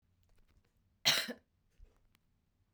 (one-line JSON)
{"cough_length": "2.7 s", "cough_amplitude": 6062, "cough_signal_mean_std_ratio": 0.23, "survey_phase": "beta (2021-08-13 to 2022-03-07)", "age": "45-64", "gender": "Female", "wearing_mask": "No", "symptom_cough_any": true, "symptom_runny_or_blocked_nose": true, "symptom_shortness_of_breath": true, "symptom_headache": true, "symptom_change_to_sense_of_smell_or_taste": true, "symptom_loss_of_taste": true, "symptom_other": true, "symptom_onset": "3 days", "smoker_status": "Never smoked", "respiratory_condition_asthma": true, "respiratory_condition_other": false, "recruitment_source": "Test and Trace", "submission_delay": "2 days", "covid_test_result": "Positive", "covid_test_method": "RT-qPCR", "covid_ct_value": 26.9, "covid_ct_gene": "N gene"}